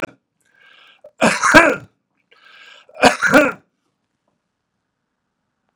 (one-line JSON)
{"three_cough_length": "5.8 s", "three_cough_amplitude": 32768, "three_cough_signal_mean_std_ratio": 0.3, "survey_phase": "beta (2021-08-13 to 2022-03-07)", "age": "45-64", "gender": "Male", "wearing_mask": "No", "symptom_none": true, "smoker_status": "Never smoked", "respiratory_condition_asthma": false, "respiratory_condition_other": false, "recruitment_source": "Test and Trace", "submission_delay": "1 day", "covid_test_result": "Negative", "covid_test_method": "RT-qPCR"}